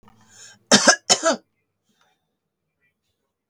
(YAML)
cough_length: 3.5 s
cough_amplitude: 32768
cough_signal_mean_std_ratio: 0.26
survey_phase: beta (2021-08-13 to 2022-03-07)
age: 65+
gender: Female
wearing_mask: 'No'
symptom_none: true
smoker_status: Never smoked
respiratory_condition_asthma: false
respiratory_condition_other: false
recruitment_source: REACT
submission_delay: 4 days
covid_test_result: Negative
covid_test_method: RT-qPCR
influenza_a_test_result: Negative
influenza_b_test_result: Negative